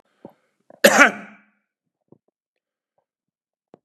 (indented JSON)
{
  "cough_length": "3.8 s",
  "cough_amplitude": 32768,
  "cough_signal_mean_std_ratio": 0.2,
  "survey_phase": "beta (2021-08-13 to 2022-03-07)",
  "age": "45-64",
  "gender": "Male",
  "wearing_mask": "No",
  "symptom_runny_or_blocked_nose": true,
  "symptom_fatigue": true,
  "smoker_status": "Current smoker (1 to 10 cigarettes per day)",
  "respiratory_condition_asthma": false,
  "respiratory_condition_other": false,
  "recruitment_source": "REACT",
  "submission_delay": "4 days",
  "covid_test_result": "Positive",
  "covid_test_method": "RT-qPCR",
  "covid_ct_value": 35.5,
  "covid_ct_gene": "N gene",
  "influenza_a_test_result": "Negative",
  "influenza_b_test_result": "Negative"
}